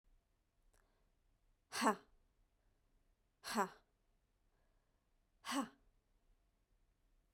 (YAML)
exhalation_length: 7.3 s
exhalation_amplitude: 2790
exhalation_signal_mean_std_ratio: 0.24
survey_phase: beta (2021-08-13 to 2022-03-07)
age: 18-44
gender: Female
wearing_mask: 'No'
symptom_none: true
smoker_status: Never smoked
respiratory_condition_asthma: false
respiratory_condition_other: false
recruitment_source: REACT
submission_delay: 2 days
covid_test_result: Negative
covid_test_method: RT-qPCR